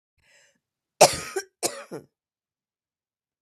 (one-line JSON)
{"cough_length": "3.4 s", "cough_amplitude": 32768, "cough_signal_mean_std_ratio": 0.2, "survey_phase": "beta (2021-08-13 to 2022-03-07)", "age": "45-64", "gender": "Female", "wearing_mask": "No", "symptom_cough_any": true, "symptom_onset": "11 days", "smoker_status": "Ex-smoker", "respiratory_condition_asthma": true, "respiratory_condition_other": false, "recruitment_source": "REACT", "submission_delay": "2 days", "covid_test_result": "Negative", "covid_test_method": "RT-qPCR", "influenza_a_test_result": "Negative", "influenza_b_test_result": "Negative"}